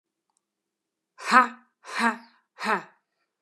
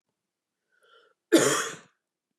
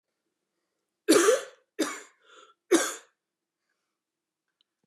{"exhalation_length": "3.4 s", "exhalation_amplitude": 27423, "exhalation_signal_mean_std_ratio": 0.28, "cough_length": "2.4 s", "cough_amplitude": 14004, "cough_signal_mean_std_ratio": 0.29, "three_cough_length": "4.9 s", "three_cough_amplitude": 13131, "three_cough_signal_mean_std_ratio": 0.28, "survey_phase": "beta (2021-08-13 to 2022-03-07)", "age": "18-44", "gender": "Female", "wearing_mask": "No", "symptom_cough_any": true, "symptom_runny_or_blocked_nose": true, "symptom_sore_throat": true, "symptom_fatigue": true, "symptom_headache": true, "smoker_status": "Never smoked", "respiratory_condition_asthma": true, "respiratory_condition_other": false, "recruitment_source": "Test and Trace", "submission_delay": "1 day", "covid_test_result": "Positive", "covid_test_method": "RT-qPCR", "covid_ct_value": 24.2, "covid_ct_gene": "S gene"}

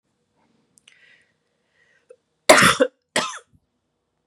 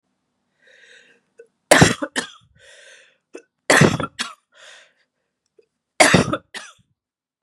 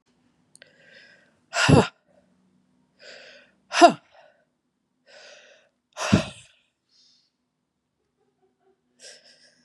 {"cough_length": "4.3 s", "cough_amplitude": 32768, "cough_signal_mean_std_ratio": 0.24, "three_cough_length": "7.4 s", "three_cough_amplitude": 32768, "three_cough_signal_mean_std_ratio": 0.28, "exhalation_length": "9.6 s", "exhalation_amplitude": 30779, "exhalation_signal_mean_std_ratio": 0.2, "survey_phase": "beta (2021-08-13 to 2022-03-07)", "age": "45-64", "gender": "Female", "wearing_mask": "No", "symptom_cough_any": true, "symptom_runny_or_blocked_nose": true, "symptom_fatigue": true, "symptom_fever_high_temperature": true, "symptom_headache": true, "symptom_change_to_sense_of_smell_or_taste": true, "symptom_onset": "3 days", "smoker_status": "Prefer not to say", "respiratory_condition_asthma": false, "respiratory_condition_other": false, "recruitment_source": "Test and Trace", "submission_delay": "2 days", "covid_test_result": "Positive", "covid_test_method": "RT-qPCR", "covid_ct_value": 14.7, "covid_ct_gene": "ORF1ab gene", "covid_ct_mean": 15.0, "covid_viral_load": "12000000 copies/ml", "covid_viral_load_category": "High viral load (>1M copies/ml)"}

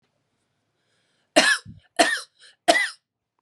{"three_cough_length": "3.4 s", "three_cough_amplitude": 27424, "three_cough_signal_mean_std_ratio": 0.33, "survey_phase": "beta (2021-08-13 to 2022-03-07)", "age": "45-64", "gender": "Female", "wearing_mask": "No", "symptom_none": true, "smoker_status": "Ex-smoker", "respiratory_condition_asthma": false, "respiratory_condition_other": false, "recruitment_source": "REACT", "submission_delay": "1 day", "covid_test_result": "Negative", "covid_test_method": "RT-qPCR"}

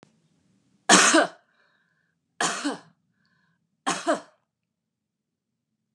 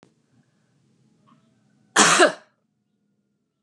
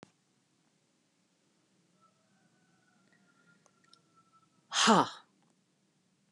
{"three_cough_length": "5.9 s", "three_cough_amplitude": 30822, "three_cough_signal_mean_std_ratio": 0.28, "cough_length": "3.6 s", "cough_amplitude": 31601, "cough_signal_mean_std_ratio": 0.25, "exhalation_length": "6.3 s", "exhalation_amplitude": 9323, "exhalation_signal_mean_std_ratio": 0.19, "survey_phase": "beta (2021-08-13 to 2022-03-07)", "age": "65+", "gender": "Female", "wearing_mask": "No", "symptom_none": true, "smoker_status": "Never smoked", "respiratory_condition_asthma": false, "respiratory_condition_other": false, "recruitment_source": "REACT", "submission_delay": "4 days", "covid_test_result": "Negative", "covid_test_method": "RT-qPCR"}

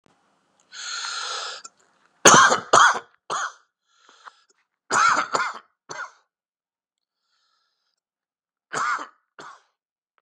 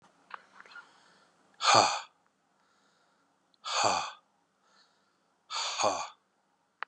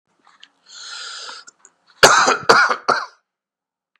{"three_cough_length": "10.2 s", "three_cough_amplitude": 32768, "three_cough_signal_mean_std_ratio": 0.31, "exhalation_length": "6.9 s", "exhalation_amplitude": 13907, "exhalation_signal_mean_std_ratio": 0.32, "cough_length": "4.0 s", "cough_amplitude": 32768, "cough_signal_mean_std_ratio": 0.36, "survey_phase": "beta (2021-08-13 to 2022-03-07)", "age": "45-64", "gender": "Male", "wearing_mask": "No", "symptom_cough_any": true, "symptom_shortness_of_breath": true, "symptom_sore_throat": true, "symptom_fatigue": true, "symptom_fever_high_temperature": true, "symptom_headache": true, "symptom_onset": "9 days", "smoker_status": "Never smoked", "respiratory_condition_asthma": false, "respiratory_condition_other": false, "recruitment_source": "REACT", "submission_delay": "3 days", "covid_test_result": "Positive", "covid_test_method": "RT-qPCR", "covid_ct_value": 21.0, "covid_ct_gene": "E gene", "influenza_a_test_result": "Negative", "influenza_b_test_result": "Negative"}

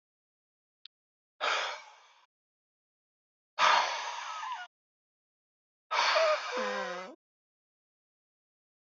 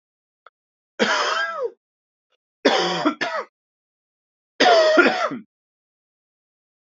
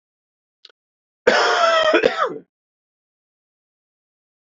{"exhalation_length": "8.9 s", "exhalation_amplitude": 9248, "exhalation_signal_mean_std_ratio": 0.39, "three_cough_length": "6.8 s", "three_cough_amplitude": 27940, "three_cough_signal_mean_std_ratio": 0.43, "cough_length": "4.4 s", "cough_amplitude": 27524, "cough_signal_mean_std_ratio": 0.38, "survey_phase": "beta (2021-08-13 to 2022-03-07)", "age": "18-44", "gender": "Male", "wearing_mask": "No", "symptom_cough_any": true, "symptom_runny_or_blocked_nose": true, "symptom_shortness_of_breath": true, "symptom_diarrhoea": true, "symptom_fatigue": true, "symptom_fever_high_temperature": true, "symptom_headache": true, "symptom_change_to_sense_of_smell_or_taste": true, "symptom_loss_of_taste": true, "symptom_other": true, "symptom_onset": "3 days", "smoker_status": "Never smoked", "respiratory_condition_asthma": false, "respiratory_condition_other": false, "recruitment_source": "Test and Trace", "submission_delay": "1 day", "covid_test_result": "Positive", "covid_test_method": "RT-qPCR", "covid_ct_value": 15.4, "covid_ct_gene": "ORF1ab gene", "covid_ct_mean": 15.9, "covid_viral_load": "6100000 copies/ml", "covid_viral_load_category": "High viral load (>1M copies/ml)"}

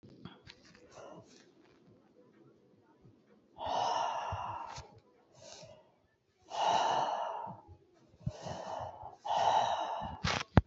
{"exhalation_length": "10.7 s", "exhalation_amplitude": 17212, "exhalation_signal_mean_std_ratio": 0.48, "survey_phase": "beta (2021-08-13 to 2022-03-07)", "age": "18-44", "gender": "Female", "wearing_mask": "No", "symptom_cough_any": true, "symptom_abdominal_pain": true, "symptom_headache": true, "symptom_onset": "12 days", "smoker_status": "Current smoker (1 to 10 cigarettes per day)", "respiratory_condition_asthma": true, "respiratory_condition_other": false, "recruitment_source": "REACT", "submission_delay": "2 days", "covid_test_result": "Negative", "covid_test_method": "RT-qPCR", "influenza_a_test_result": "Negative", "influenza_b_test_result": "Negative"}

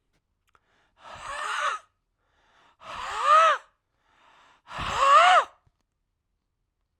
{"exhalation_length": "7.0 s", "exhalation_amplitude": 16307, "exhalation_signal_mean_std_ratio": 0.37, "survey_phase": "alpha (2021-03-01 to 2021-08-12)", "age": "45-64", "gender": "Male", "wearing_mask": "No", "symptom_cough_any": true, "symptom_change_to_sense_of_smell_or_taste": true, "symptom_loss_of_taste": true, "symptom_onset": "6 days", "smoker_status": "Ex-smoker", "respiratory_condition_asthma": true, "respiratory_condition_other": false, "recruitment_source": "Test and Trace", "submission_delay": "2 days", "covid_test_result": "Positive", "covid_test_method": "RT-qPCR", "covid_ct_value": 18.6, "covid_ct_gene": "ORF1ab gene"}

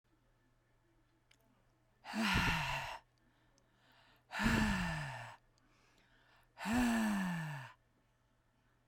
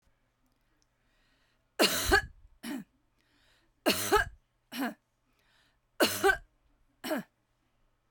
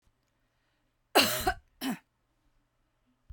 {"exhalation_length": "8.9 s", "exhalation_amplitude": 3112, "exhalation_signal_mean_std_ratio": 0.49, "three_cough_length": "8.1 s", "three_cough_amplitude": 10461, "three_cough_signal_mean_std_ratio": 0.33, "cough_length": "3.3 s", "cough_amplitude": 12562, "cough_signal_mean_std_ratio": 0.28, "survey_phase": "beta (2021-08-13 to 2022-03-07)", "age": "45-64", "gender": "Female", "wearing_mask": "No", "symptom_none": true, "smoker_status": "Never smoked", "respiratory_condition_asthma": false, "respiratory_condition_other": false, "recruitment_source": "REACT", "submission_delay": "2 days", "covid_test_result": "Negative", "covid_test_method": "RT-qPCR", "influenza_a_test_result": "Negative", "influenza_b_test_result": "Negative"}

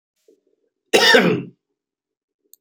{"cough_length": "2.6 s", "cough_amplitude": 30763, "cough_signal_mean_std_ratio": 0.34, "survey_phase": "beta (2021-08-13 to 2022-03-07)", "age": "45-64", "gender": "Male", "wearing_mask": "No", "symptom_none": true, "smoker_status": "Never smoked", "respiratory_condition_asthma": false, "respiratory_condition_other": false, "recruitment_source": "REACT", "submission_delay": "1 day", "covid_test_result": "Negative", "covid_test_method": "RT-qPCR", "influenza_a_test_result": "Negative", "influenza_b_test_result": "Negative"}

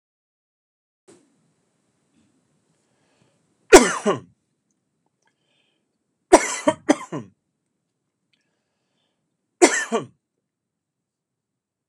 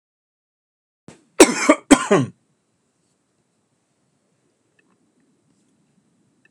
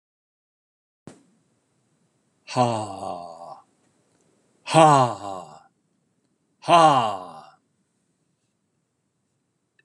{"three_cough_length": "11.9 s", "three_cough_amplitude": 32768, "three_cough_signal_mean_std_ratio": 0.18, "cough_length": "6.5 s", "cough_amplitude": 32768, "cough_signal_mean_std_ratio": 0.2, "exhalation_length": "9.8 s", "exhalation_amplitude": 30289, "exhalation_signal_mean_std_ratio": 0.29, "survey_phase": "alpha (2021-03-01 to 2021-08-12)", "age": "65+", "gender": "Male", "wearing_mask": "No", "symptom_none": true, "smoker_status": "Ex-smoker", "respiratory_condition_asthma": false, "respiratory_condition_other": false, "recruitment_source": "REACT", "submission_delay": "2 days", "covid_test_result": "Negative", "covid_test_method": "RT-qPCR"}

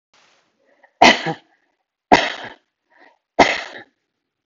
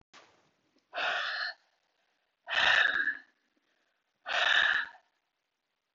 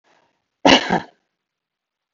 {"three_cough_length": "4.5 s", "three_cough_amplitude": 32768, "three_cough_signal_mean_std_ratio": 0.27, "exhalation_length": "5.9 s", "exhalation_amplitude": 7755, "exhalation_signal_mean_std_ratio": 0.43, "cough_length": "2.1 s", "cough_amplitude": 32768, "cough_signal_mean_std_ratio": 0.26, "survey_phase": "beta (2021-08-13 to 2022-03-07)", "age": "45-64", "gender": "Female", "wearing_mask": "No", "symptom_none": true, "symptom_onset": "12 days", "smoker_status": "Never smoked", "respiratory_condition_asthma": true, "respiratory_condition_other": false, "recruitment_source": "REACT", "submission_delay": "7 days", "covid_test_result": "Negative", "covid_test_method": "RT-qPCR", "influenza_a_test_result": "Negative", "influenza_b_test_result": "Negative"}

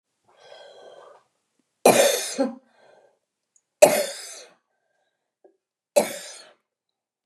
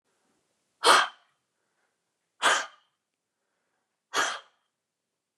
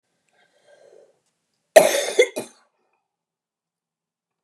{"three_cough_length": "7.3 s", "three_cough_amplitude": 29204, "three_cough_signal_mean_std_ratio": 0.27, "exhalation_length": "5.4 s", "exhalation_amplitude": 20041, "exhalation_signal_mean_std_ratio": 0.26, "cough_length": "4.4 s", "cough_amplitude": 29204, "cough_signal_mean_std_ratio": 0.21, "survey_phase": "beta (2021-08-13 to 2022-03-07)", "age": "65+", "gender": "Female", "wearing_mask": "No", "symptom_none": true, "smoker_status": "Ex-smoker", "respiratory_condition_asthma": false, "respiratory_condition_other": false, "recruitment_source": "REACT", "submission_delay": "2 days", "covid_test_result": "Negative", "covid_test_method": "RT-qPCR", "influenza_a_test_result": "Negative", "influenza_b_test_result": "Negative"}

